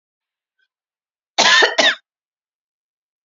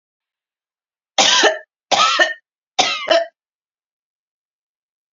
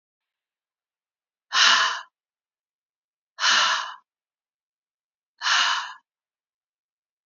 {"cough_length": "3.2 s", "cough_amplitude": 30391, "cough_signal_mean_std_ratio": 0.32, "three_cough_length": "5.1 s", "three_cough_amplitude": 31867, "three_cough_signal_mean_std_ratio": 0.38, "exhalation_length": "7.3 s", "exhalation_amplitude": 21230, "exhalation_signal_mean_std_ratio": 0.34, "survey_phase": "beta (2021-08-13 to 2022-03-07)", "age": "18-44", "gender": "Female", "wearing_mask": "No", "symptom_shortness_of_breath": true, "symptom_fatigue": true, "smoker_status": "Ex-smoker", "respiratory_condition_asthma": false, "respiratory_condition_other": false, "recruitment_source": "Test and Trace", "submission_delay": "1 day", "covid_test_result": "Negative", "covid_test_method": "RT-qPCR"}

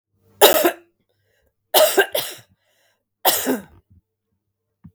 {"three_cough_length": "4.9 s", "three_cough_amplitude": 32768, "three_cough_signal_mean_std_ratio": 0.34, "survey_phase": "beta (2021-08-13 to 2022-03-07)", "age": "45-64", "gender": "Female", "wearing_mask": "No", "symptom_none": true, "smoker_status": "Never smoked", "respiratory_condition_asthma": true, "respiratory_condition_other": false, "recruitment_source": "REACT", "submission_delay": "2 days", "covid_test_result": "Negative", "covid_test_method": "RT-qPCR", "influenza_a_test_result": "Negative", "influenza_b_test_result": "Negative"}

